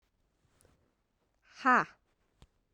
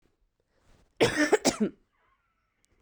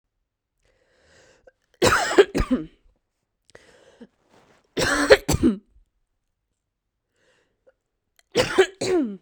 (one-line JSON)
{"exhalation_length": "2.7 s", "exhalation_amplitude": 7095, "exhalation_signal_mean_std_ratio": 0.21, "cough_length": "2.8 s", "cough_amplitude": 11849, "cough_signal_mean_std_ratio": 0.33, "three_cough_length": "9.2 s", "three_cough_amplitude": 32768, "three_cough_signal_mean_std_ratio": 0.33, "survey_phase": "beta (2021-08-13 to 2022-03-07)", "age": "18-44", "gender": "Female", "wearing_mask": "No", "symptom_none": true, "smoker_status": "Never smoked", "respiratory_condition_asthma": false, "respiratory_condition_other": false, "recruitment_source": "REACT", "submission_delay": "3 days", "covid_test_result": "Negative", "covid_test_method": "RT-qPCR"}